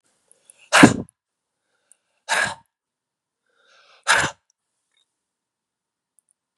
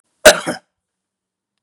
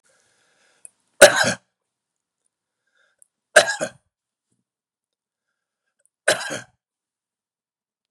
{"exhalation_length": "6.6 s", "exhalation_amplitude": 32768, "exhalation_signal_mean_std_ratio": 0.21, "cough_length": "1.6 s", "cough_amplitude": 32768, "cough_signal_mean_std_ratio": 0.23, "three_cough_length": "8.1 s", "three_cough_amplitude": 32768, "three_cough_signal_mean_std_ratio": 0.18, "survey_phase": "beta (2021-08-13 to 2022-03-07)", "age": "45-64", "gender": "Male", "wearing_mask": "No", "symptom_none": true, "smoker_status": "Never smoked", "respiratory_condition_asthma": false, "respiratory_condition_other": false, "recruitment_source": "Test and Trace", "submission_delay": "2 days", "covid_test_result": "Negative", "covid_test_method": "RT-qPCR"}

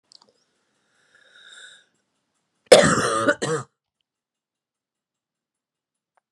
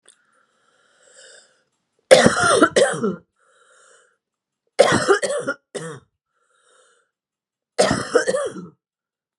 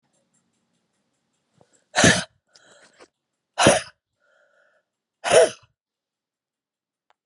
{"cough_length": "6.3 s", "cough_amplitude": 32768, "cough_signal_mean_std_ratio": 0.23, "three_cough_length": "9.4 s", "three_cough_amplitude": 32768, "three_cough_signal_mean_std_ratio": 0.36, "exhalation_length": "7.3 s", "exhalation_amplitude": 32133, "exhalation_signal_mean_std_ratio": 0.24, "survey_phase": "beta (2021-08-13 to 2022-03-07)", "age": "65+", "gender": "Female", "wearing_mask": "No", "symptom_cough_any": true, "symptom_runny_or_blocked_nose": true, "symptom_fatigue": true, "symptom_onset": "3 days", "smoker_status": "Never smoked", "respiratory_condition_asthma": false, "respiratory_condition_other": false, "recruitment_source": "Test and Trace", "submission_delay": "2 days", "covid_test_result": "Positive", "covid_test_method": "RT-qPCR", "covid_ct_value": 26.4, "covid_ct_gene": "ORF1ab gene", "covid_ct_mean": 27.0, "covid_viral_load": "1400 copies/ml", "covid_viral_load_category": "Minimal viral load (< 10K copies/ml)"}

